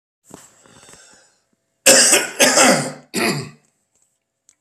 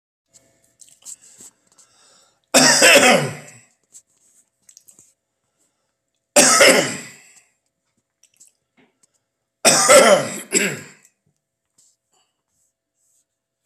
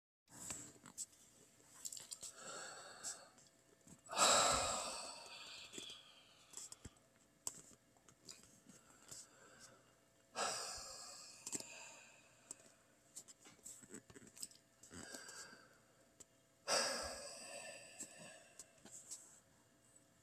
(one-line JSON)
{"cough_length": "4.6 s", "cough_amplitude": 32768, "cough_signal_mean_std_ratio": 0.4, "three_cough_length": "13.7 s", "three_cough_amplitude": 32768, "three_cough_signal_mean_std_ratio": 0.32, "exhalation_length": "20.2 s", "exhalation_amplitude": 3162, "exhalation_signal_mean_std_ratio": 0.39, "survey_phase": "beta (2021-08-13 to 2022-03-07)", "age": "45-64", "gender": "Male", "wearing_mask": "No", "symptom_none": true, "smoker_status": "Ex-smoker", "respiratory_condition_asthma": false, "respiratory_condition_other": false, "recruitment_source": "REACT", "submission_delay": "-1 day", "covid_test_result": "Negative", "covid_test_method": "RT-qPCR", "influenza_a_test_result": "Unknown/Void", "influenza_b_test_result": "Unknown/Void"}